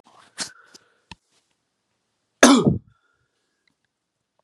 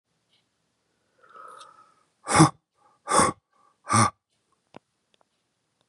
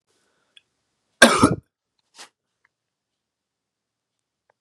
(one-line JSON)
{"three_cough_length": "4.4 s", "three_cough_amplitude": 32768, "three_cough_signal_mean_std_ratio": 0.22, "exhalation_length": "5.9 s", "exhalation_amplitude": 23441, "exhalation_signal_mean_std_ratio": 0.25, "cough_length": "4.6 s", "cough_amplitude": 32768, "cough_signal_mean_std_ratio": 0.18, "survey_phase": "beta (2021-08-13 to 2022-03-07)", "age": "45-64", "gender": "Male", "wearing_mask": "No", "symptom_cough_any": true, "symptom_runny_or_blocked_nose": true, "symptom_headache": true, "symptom_onset": "4 days", "smoker_status": "Never smoked", "respiratory_condition_asthma": false, "respiratory_condition_other": false, "recruitment_source": "Test and Trace", "submission_delay": "1 day", "covid_test_result": "Positive", "covid_test_method": "ePCR"}